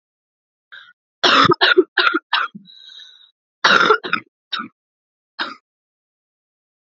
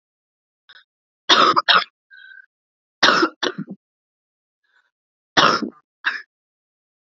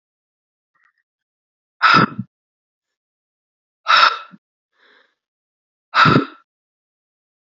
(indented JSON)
{
  "cough_length": "7.0 s",
  "cough_amplitude": 32278,
  "cough_signal_mean_std_ratio": 0.35,
  "three_cough_length": "7.2 s",
  "three_cough_amplitude": 30435,
  "three_cough_signal_mean_std_ratio": 0.32,
  "exhalation_length": "7.5 s",
  "exhalation_amplitude": 32767,
  "exhalation_signal_mean_std_ratio": 0.27,
  "survey_phase": "alpha (2021-03-01 to 2021-08-12)",
  "age": "18-44",
  "gender": "Female",
  "wearing_mask": "No",
  "symptom_cough_any": true,
  "symptom_new_continuous_cough": true,
  "symptom_fatigue": true,
  "symptom_fever_high_temperature": true,
  "symptom_headache": true,
  "symptom_onset": "3 days",
  "smoker_status": "Never smoked",
  "respiratory_condition_asthma": false,
  "respiratory_condition_other": false,
  "recruitment_source": "Test and Trace",
  "submission_delay": "1 day",
  "covid_test_result": "Positive",
  "covid_test_method": "RT-qPCR",
  "covid_ct_value": 18.0,
  "covid_ct_gene": "ORF1ab gene",
  "covid_ct_mean": 19.4,
  "covid_viral_load": "440000 copies/ml",
  "covid_viral_load_category": "Low viral load (10K-1M copies/ml)"
}